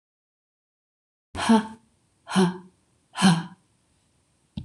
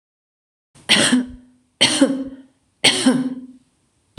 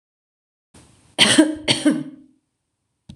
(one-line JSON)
{"exhalation_length": "4.6 s", "exhalation_amplitude": 20392, "exhalation_signal_mean_std_ratio": 0.32, "three_cough_length": "4.2 s", "three_cough_amplitude": 26028, "three_cough_signal_mean_std_ratio": 0.45, "cough_length": "3.2 s", "cough_amplitude": 26028, "cough_signal_mean_std_ratio": 0.36, "survey_phase": "beta (2021-08-13 to 2022-03-07)", "age": "18-44", "gender": "Female", "wearing_mask": "No", "symptom_none": true, "smoker_status": "Never smoked", "respiratory_condition_asthma": false, "respiratory_condition_other": false, "recruitment_source": "REACT", "submission_delay": "1 day", "covid_test_result": "Negative", "covid_test_method": "RT-qPCR"}